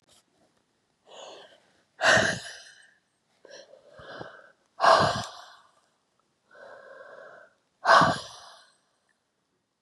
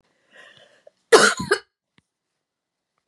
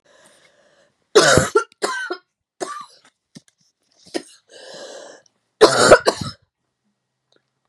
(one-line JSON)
{"exhalation_length": "9.8 s", "exhalation_amplitude": 19959, "exhalation_signal_mean_std_ratio": 0.29, "cough_length": "3.1 s", "cough_amplitude": 32754, "cough_signal_mean_std_ratio": 0.24, "three_cough_length": "7.7 s", "three_cough_amplitude": 32768, "three_cough_signal_mean_std_ratio": 0.29, "survey_phase": "beta (2021-08-13 to 2022-03-07)", "age": "45-64", "gender": "Female", "wearing_mask": "No", "symptom_cough_any": true, "symptom_runny_or_blocked_nose": true, "symptom_sore_throat": true, "symptom_fatigue": true, "symptom_change_to_sense_of_smell_or_taste": true, "symptom_loss_of_taste": true, "symptom_other": true, "symptom_onset": "3 days", "smoker_status": "Ex-smoker", "respiratory_condition_asthma": false, "respiratory_condition_other": false, "recruitment_source": "Test and Trace", "submission_delay": "0 days", "covid_test_result": "Positive", "covid_test_method": "RT-qPCR", "covid_ct_value": 26.3, "covid_ct_gene": "ORF1ab gene"}